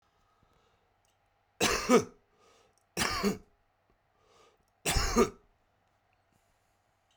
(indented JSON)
{
  "three_cough_length": "7.2 s",
  "three_cough_amplitude": 13545,
  "three_cough_signal_mean_std_ratio": 0.31,
  "survey_phase": "beta (2021-08-13 to 2022-03-07)",
  "age": "45-64",
  "gender": "Male",
  "wearing_mask": "No",
  "symptom_shortness_of_breath": true,
  "smoker_status": "Current smoker (1 to 10 cigarettes per day)",
  "respiratory_condition_asthma": true,
  "respiratory_condition_other": true,
  "recruitment_source": "REACT",
  "submission_delay": "2 days",
  "covid_test_result": "Negative",
  "covid_test_method": "RT-qPCR"
}